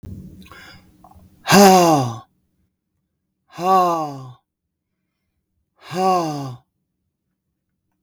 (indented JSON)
{
  "exhalation_length": "8.0 s",
  "exhalation_amplitude": 32766,
  "exhalation_signal_mean_std_ratio": 0.35,
  "survey_phase": "beta (2021-08-13 to 2022-03-07)",
  "age": "65+",
  "gender": "Male",
  "wearing_mask": "No",
  "symptom_none": true,
  "smoker_status": "Ex-smoker",
  "respiratory_condition_asthma": false,
  "respiratory_condition_other": false,
  "recruitment_source": "REACT",
  "submission_delay": "3 days",
  "covid_test_result": "Negative",
  "covid_test_method": "RT-qPCR",
  "influenza_a_test_result": "Negative",
  "influenza_b_test_result": "Negative"
}